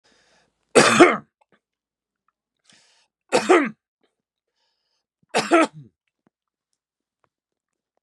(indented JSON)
{
  "three_cough_length": "8.0 s",
  "three_cough_amplitude": 32767,
  "three_cough_signal_mean_std_ratio": 0.26,
  "survey_phase": "beta (2021-08-13 to 2022-03-07)",
  "age": "45-64",
  "gender": "Male",
  "wearing_mask": "No",
  "symptom_cough_any": true,
  "symptom_runny_or_blocked_nose": true,
  "symptom_change_to_sense_of_smell_or_taste": true,
  "symptom_onset": "5 days",
  "smoker_status": "Current smoker (1 to 10 cigarettes per day)",
  "respiratory_condition_asthma": false,
  "respiratory_condition_other": false,
  "recruitment_source": "Test and Trace",
  "submission_delay": "2 days",
  "covid_test_result": "Positive",
  "covid_test_method": "RT-qPCR"
}